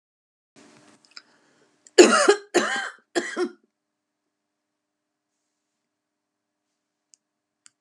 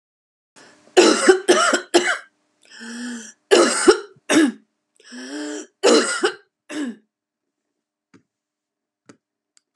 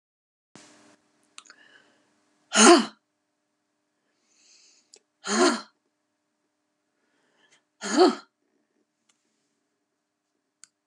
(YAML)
cough_length: 7.8 s
cough_amplitude: 32474
cough_signal_mean_std_ratio: 0.23
three_cough_length: 9.8 s
three_cough_amplitude: 32767
three_cough_signal_mean_std_ratio: 0.4
exhalation_length: 10.9 s
exhalation_amplitude: 26358
exhalation_signal_mean_std_ratio: 0.21
survey_phase: beta (2021-08-13 to 2022-03-07)
age: 65+
gender: Female
wearing_mask: 'No'
symptom_none: true
smoker_status: Ex-smoker
respiratory_condition_asthma: false
respiratory_condition_other: false
recruitment_source: REACT
submission_delay: 1 day
covid_test_result: Negative
covid_test_method: RT-qPCR
influenza_a_test_result: Negative
influenza_b_test_result: Negative